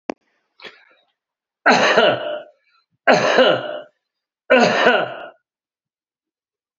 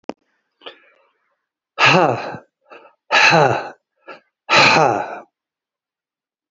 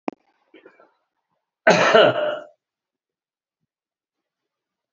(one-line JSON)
{"three_cough_length": "6.8 s", "three_cough_amplitude": 32768, "three_cough_signal_mean_std_ratio": 0.43, "exhalation_length": "6.5 s", "exhalation_amplitude": 30669, "exhalation_signal_mean_std_ratio": 0.4, "cough_length": "4.9 s", "cough_amplitude": 29843, "cough_signal_mean_std_ratio": 0.28, "survey_phase": "beta (2021-08-13 to 2022-03-07)", "age": "65+", "gender": "Male", "wearing_mask": "No", "symptom_cough_any": true, "smoker_status": "Current smoker (11 or more cigarettes per day)", "respiratory_condition_asthma": false, "respiratory_condition_other": false, "recruitment_source": "REACT", "submission_delay": "0 days", "covid_test_result": "Negative", "covid_test_method": "RT-qPCR", "influenza_a_test_result": "Negative", "influenza_b_test_result": "Negative"}